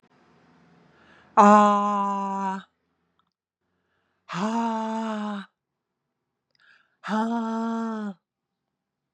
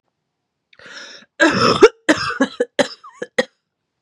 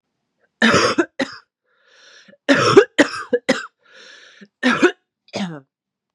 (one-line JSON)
{"exhalation_length": "9.1 s", "exhalation_amplitude": 24997, "exhalation_signal_mean_std_ratio": 0.41, "cough_length": "4.0 s", "cough_amplitude": 32768, "cough_signal_mean_std_ratio": 0.36, "three_cough_length": "6.1 s", "three_cough_amplitude": 32768, "three_cough_signal_mean_std_ratio": 0.38, "survey_phase": "beta (2021-08-13 to 2022-03-07)", "age": "18-44", "gender": "Female", "wearing_mask": "No", "symptom_cough_any": true, "symptom_runny_or_blocked_nose": true, "symptom_sore_throat": true, "symptom_headache": true, "symptom_onset": "2 days", "smoker_status": "Never smoked", "respiratory_condition_asthma": false, "respiratory_condition_other": false, "recruitment_source": "Test and Trace", "submission_delay": "2 days", "covid_test_result": "Positive", "covid_test_method": "RT-qPCR"}